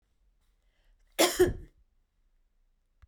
{
  "cough_length": "3.1 s",
  "cough_amplitude": 12214,
  "cough_signal_mean_std_ratio": 0.25,
  "survey_phase": "beta (2021-08-13 to 2022-03-07)",
  "age": "65+",
  "gender": "Female",
  "wearing_mask": "No",
  "symptom_none": true,
  "smoker_status": "Never smoked",
  "respiratory_condition_asthma": false,
  "respiratory_condition_other": false,
  "recruitment_source": "REACT",
  "submission_delay": "1 day",
  "covid_test_result": "Negative",
  "covid_test_method": "RT-qPCR"
}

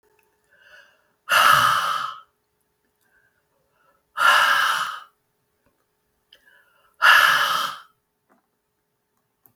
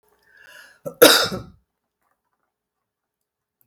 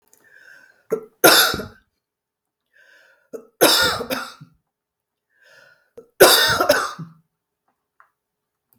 {
  "exhalation_length": "9.6 s",
  "exhalation_amplitude": 32320,
  "exhalation_signal_mean_std_ratio": 0.38,
  "cough_length": "3.7 s",
  "cough_amplitude": 32768,
  "cough_signal_mean_std_ratio": 0.22,
  "three_cough_length": "8.8 s",
  "three_cough_amplitude": 32768,
  "three_cough_signal_mean_std_ratio": 0.33,
  "survey_phase": "beta (2021-08-13 to 2022-03-07)",
  "age": "65+",
  "gender": "Female",
  "wearing_mask": "No",
  "symptom_cough_any": true,
  "smoker_status": "Ex-smoker",
  "respiratory_condition_asthma": false,
  "respiratory_condition_other": false,
  "recruitment_source": "REACT",
  "submission_delay": "1 day",
  "covid_test_result": "Negative",
  "covid_test_method": "RT-qPCR",
  "influenza_a_test_result": "Negative",
  "influenza_b_test_result": "Negative"
}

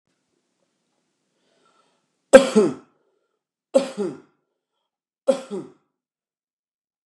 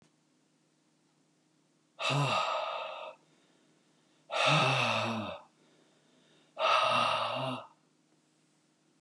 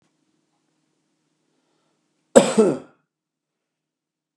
{
  "three_cough_length": "7.1 s",
  "three_cough_amplitude": 32768,
  "three_cough_signal_mean_std_ratio": 0.2,
  "exhalation_length": "9.0 s",
  "exhalation_amplitude": 6144,
  "exhalation_signal_mean_std_ratio": 0.49,
  "cough_length": "4.4 s",
  "cough_amplitude": 32768,
  "cough_signal_mean_std_ratio": 0.2,
  "survey_phase": "beta (2021-08-13 to 2022-03-07)",
  "age": "45-64",
  "gender": "Male",
  "wearing_mask": "No",
  "symptom_none": true,
  "smoker_status": "Never smoked",
  "respiratory_condition_asthma": false,
  "respiratory_condition_other": false,
  "recruitment_source": "REACT",
  "submission_delay": "2 days",
  "covid_test_result": "Negative",
  "covid_test_method": "RT-qPCR",
  "influenza_a_test_result": "Negative",
  "influenza_b_test_result": "Negative"
}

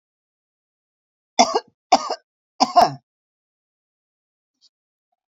{
  "three_cough_length": "5.3 s",
  "three_cough_amplitude": 32768,
  "three_cough_signal_mean_std_ratio": 0.23,
  "survey_phase": "beta (2021-08-13 to 2022-03-07)",
  "age": "45-64",
  "gender": "Female",
  "wearing_mask": "No",
  "symptom_none": true,
  "smoker_status": "Current smoker (1 to 10 cigarettes per day)",
  "respiratory_condition_asthma": false,
  "respiratory_condition_other": false,
  "recruitment_source": "REACT",
  "submission_delay": "4 days",
  "covid_test_result": "Negative",
  "covid_test_method": "RT-qPCR"
}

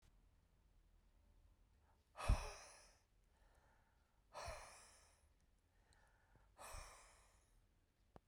{
  "exhalation_length": "8.3 s",
  "exhalation_amplitude": 1929,
  "exhalation_signal_mean_std_ratio": 0.26,
  "survey_phase": "beta (2021-08-13 to 2022-03-07)",
  "age": "45-64",
  "gender": "Male",
  "wearing_mask": "No",
  "symptom_none": true,
  "smoker_status": "Ex-smoker",
  "respiratory_condition_asthma": false,
  "respiratory_condition_other": false,
  "recruitment_source": "REACT",
  "submission_delay": "2 days",
  "covid_test_result": "Negative",
  "covid_test_method": "RT-qPCR",
  "influenza_a_test_result": "Negative",
  "influenza_b_test_result": "Negative"
}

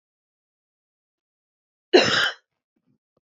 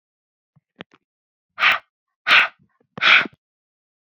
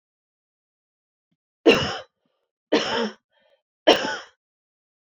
{
  "cough_length": "3.2 s",
  "cough_amplitude": 26636,
  "cough_signal_mean_std_ratio": 0.24,
  "exhalation_length": "4.2 s",
  "exhalation_amplitude": 28263,
  "exhalation_signal_mean_std_ratio": 0.3,
  "three_cough_length": "5.1 s",
  "three_cough_amplitude": 27098,
  "three_cough_signal_mean_std_ratio": 0.29,
  "survey_phase": "beta (2021-08-13 to 2022-03-07)",
  "age": "18-44",
  "gender": "Female",
  "wearing_mask": "No",
  "symptom_new_continuous_cough": true,
  "symptom_runny_or_blocked_nose": true,
  "symptom_diarrhoea": true,
  "symptom_fatigue": true,
  "symptom_headache": true,
  "smoker_status": "Ex-smoker",
  "respiratory_condition_asthma": false,
  "respiratory_condition_other": false,
  "recruitment_source": "Test and Trace",
  "submission_delay": "1 day",
  "covid_test_result": "Positive",
  "covid_test_method": "RT-qPCR",
  "covid_ct_value": 23.1,
  "covid_ct_gene": "ORF1ab gene"
}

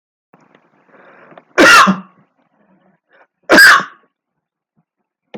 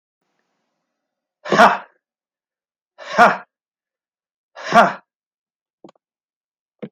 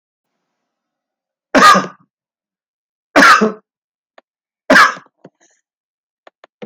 {
  "cough_length": "5.4 s",
  "cough_amplitude": 32768,
  "cough_signal_mean_std_ratio": 0.33,
  "exhalation_length": "6.9 s",
  "exhalation_amplitude": 31147,
  "exhalation_signal_mean_std_ratio": 0.24,
  "three_cough_length": "6.7 s",
  "three_cough_amplitude": 32768,
  "three_cough_signal_mean_std_ratio": 0.3,
  "survey_phase": "alpha (2021-03-01 to 2021-08-12)",
  "age": "45-64",
  "gender": "Male",
  "wearing_mask": "No",
  "symptom_none": true,
  "smoker_status": "Never smoked",
  "respiratory_condition_asthma": false,
  "respiratory_condition_other": false,
  "recruitment_source": "REACT",
  "submission_delay": "2 days",
  "covid_test_result": "Negative",
  "covid_test_method": "RT-qPCR"
}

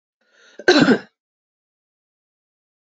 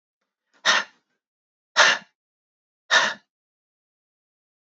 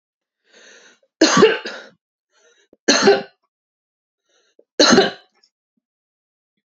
{
  "cough_length": "2.9 s",
  "cough_amplitude": 29934,
  "cough_signal_mean_std_ratio": 0.26,
  "exhalation_length": "4.8 s",
  "exhalation_amplitude": 27676,
  "exhalation_signal_mean_std_ratio": 0.27,
  "three_cough_length": "6.7 s",
  "three_cough_amplitude": 29386,
  "three_cough_signal_mean_std_ratio": 0.31,
  "survey_phase": "beta (2021-08-13 to 2022-03-07)",
  "age": "45-64",
  "gender": "Female",
  "wearing_mask": "No",
  "symptom_sore_throat": true,
  "symptom_headache": true,
  "smoker_status": "Never smoked",
  "respiratory_condition_asthma": false,
  "respiratory_condition_other": false,
  "recruitment_source": "Test and Trace",
  "submission_delay": "3 days",
  "covid_test_result": "Negative",
  "covid_test_method": "RT-qPCR"
}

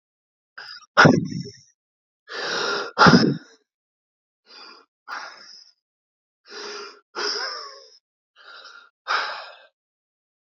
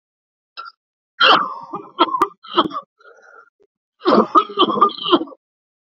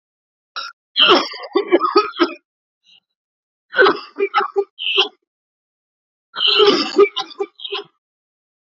{
  "exhalation_length": "10.5 s",
  "exhalation_amplitude": 29214,
  "exhalation_signal_mean_std_ratio": 0.31,
  "cough_length": "5.9 s",
  "cough_amplitude": 31441,
  "cough_signal_mean_std_ratio": 0.41,
  "three_cough_length": "8.6 s",
  "three_cough_amplitude": 32768,
  "three_cough_signal_mean_std_ratio": 0.43,
  "survey_phase": "beta (2021-08-13 to 2022-03-07)",
  "age": "45-64",
  "gender": "Male",
  "wearing_mask": "No",
  "symptom_cough_any": true,
  "symptom_runny_or_blocked_nose": true,
  "symptom_sore_throat": true,
  "symptom_abdominal_pain": true,
  "symptom_diarrhoea": true,
  "symptom_fatigue": true,
  "symptom_headache": true,
  "symptom_change_to_sense_of_smell_or_taste": true,
  "symptom_onset": "5 days",
  "smoker_status": "Ex-smoker",
  "respiratory_condition_asthma": false,
  "respiratory_condition_other": false,
  "recruitment_source": "Test and Trace",
  "submission_delay": "1 day",
  "covid_test_result": "Positive",
  "covid_test_method": "ePCR"
}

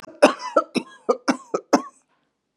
{
  "cough_length": "2.6 s",
  "cough_amplitude": 29943,
  "cough_signal_mean_std_ratio": 0.33,
  "survey_phase": "beta (2021-08-13 to 2022-03-07)",
  "age": "45-64",
  "gender": "Female",
  "wearing_mask": "No",
  "symptom_none": true,
  "symptom_onset": "12 days",
  "smoker_status": "Never smoked",
  "respiratory_condition_asthma": false,
  "respiratory_condition_other": false,
  "recruitment_source": "REACT",
  "submission_delay": "1 day",
  "covid_test_result": "Negative",
  "covid_test_method": "RT-qPCR",
  "influenza_a_test_result": "Unknown/Void",
  "influenza_b_test_result": "Unknown/Void"
}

